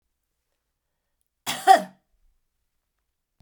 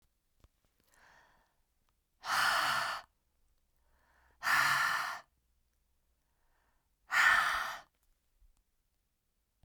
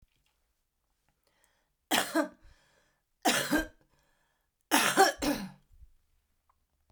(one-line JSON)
{"cough_length": "3.4 s", "cough_amplitude": 26711, "cough_signal_mean_std_ratio": 0.18, "exhalation_length": "9.6 s", "exhalation_amplitude": 6485, "exhalation_signal_mean_std_ratio": 0.38, "three_cough_length": "6.9 s", "three_cough_amplitude": 13289, "three_cough_signal_mean_std_ratio": 0.33, "survey_phase": "beta (2021-08-13 to 2022-03-07)", "age": "65+", "gender": "Female", "wearing_mask": "No", "symptom_cough_any": true, "symptom_runny_or_blocked_nose": true, "symptom_sore_throat": true, "symptom_headache": true, "smoker_status": "Ex-smoker", "respiratory_condition_asthma": false, "respiratory_condition_other": false, "recruitment_source": "Test and Trace", "submission_delay": "1 day", "covid_test_result": "Positive", "covid_test_method": "RT-qPCR", "covid_ct_value": 19.4, "covid_ct_gene": "N gene", "covid_ct_mean": 20.0, "covid_viral_load": "270000 copies/ml", "covid_viral_load_category": "Low viral load (10K-1M copies/ml)"}